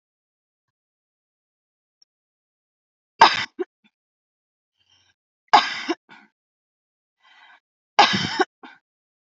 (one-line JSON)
{"three_cough_length": "9.4 s", "three_cough_amplitude": 30286, "three_cough_signal_mean_std_ratio": 0.2, "survey_phase": "alpha (2021-03-01 to 2021-08-12)", "age": "18-44", "gender": "Female", "wearing_mask": "No", "symptom_none": true, "symptom_onset": "3 days", "smoker_status": "Never smoked", "respiratory_condition_asthma": false, "respiratory_condition_other": false, "recruitment_source": "REACT", "submission_delay": "2 days", "covid_test_result": "Negative", "covid_test_method": "RT-qPCR"}